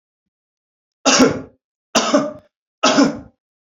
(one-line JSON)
{"three_cough_length": "3.8 s", "three_cough_amplitude": 32767, "three_cough_signal_mean_std_ratio": 0.41, "survey_phase": "beta (2021-08-13 to 2022-03-07)", "age": "18-44", "gender": "Male", "wearing_mask": "No", "symptom_none": true, "smoker_status": "Never smoked", "respiratory_condition_asthma": false, "respiratory_condition_other": false, "recruitment_source": "REACT", "submission_delay": "2 days", "covid_test_result": "Negative", "covid_test_method": "RT-qPCR", "influenza_a_test_result": "Negative", "influenza_b_test_result": "Negative"}